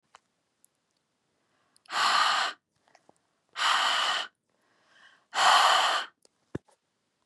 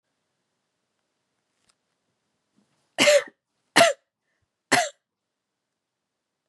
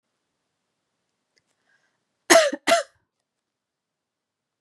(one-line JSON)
{"exhalation_length": "7.3 s", "exhalation_amplitude": 12207, "exhalation_signal_mean_std_ratio": 0.43, "three_cough_length": "6.5 s", "three_cough_amplitude": 31077, "three_cough_signal_mean_std_ratio": 0.22, "cough_length": "4.6 s", "cough_amplitude": 32767, "cough_signal_mean_std_ratio": 0.22, "survey_phase": "beta (2021-08-13 to 2022-03-07)", "age": "18-44", "gender": "Female", "wearing_mask": "No", "symptom_runny_or_blocked_nose": true, "symptom_onset": "12 days", "smoker_status": "Never smoked", "respiratory_condition_asthma": false, "respiratory_condition_other": false, "recruitment_source": "REACT", "submission_delay": "1 day", "covid_test_result": "Negative", "covid_test_method": "RT-qPCR", "influenza_a_test_result": "Negative", "influenza_b_test_result": "Negative"}